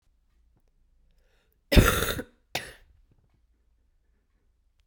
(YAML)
cough_length: 4.9 s
cough_amplitude: 26261
cough_signal_mean_std_ratio: 0.22
survey_phase: beta (2021-08-13 to 2022-03-07)
age: 18-44
gender: Female
wearing_mask: 'No'
symptom_cough_any: true
symptom_new_continuous_cough: true
symptom_fatigue: true
symptom_fever_high_temperature: true
symptom_headache: true
symptom_onset: 3 days
smoker_status: Ex-smoker
respiratory_condition_asthma: false
respiratory_condition_other: false
recruitment_source: Test and Trace
submission_delay: 1 day
covid_test_result: Positive
covid_test_method: RT-qPCR
covid_ct_value: 16.8
covid_ct_gene: ORF1ab gene
covid_ct_mean: 17.5
covid_viral_load: 1800000 copies/ml
covid_viral_load_category: High viral load (>1M copies/ml)